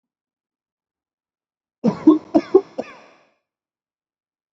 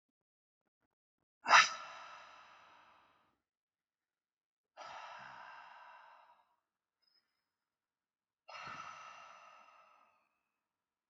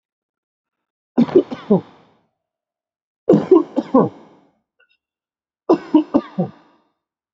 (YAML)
cough_length: 4.5 s
cough_amplitude: 26806
cough_signal_mean_std_ratio: 0.22
exhalation_length: 11.1 s
exhalation_amplitude: 10141
exhalation_signal_mean_std_ratio: 0.17
three_cough_length: 7.3 s
three_cough_amplitude: 28109
three_cough_signal_mean_std_ratio: 0.31
survey_phase: beta (2021-08-13 to 2022-03-07)
age: 18-44
gender: Male
wearing_mask: 'No'
symptom_none: true
smoker_status: Ex-smoker
respiratory_condition_asthma: false
respiratory_condition_other: false
recruitment_source: REACT
submission_delay: 2 days
covid_test_result: Negative
covid_test_method: RT-qPCR
influenza_a_test_result: Negative
influenza_b_test_result: Negative